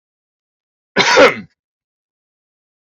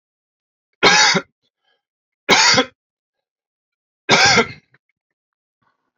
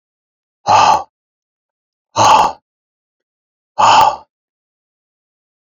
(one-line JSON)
{"cough_length": "2.9 s", "cough_amplitude": 32767, "cough_signal_mean_std_ratio": 0.29, "three_cough_length": "6.0 s", "three_cough_amplitude": 31245, "three_cough_signal_mean_std_ratio": 0.35, "exhalation_length": "5.7 s", "exhalation_amplitude": 29520, "exhalation_signal_mean_std_ratio": 0.36, "survey_phase": "beta (2021-08-13 to 2022-03-07)", "age": "45-64", "gender": "Male", "wearing_mask": "No", "symptom_none": true, "smoker_status": "Never smoked", "respiratory_condition_asthma": false, "respiratory_condition_other": false, "recruitment_source": "REACT", "submission_delay": "5 days", "covid_test_result": "Negative", "covid_test_method": "RT-qPCR"}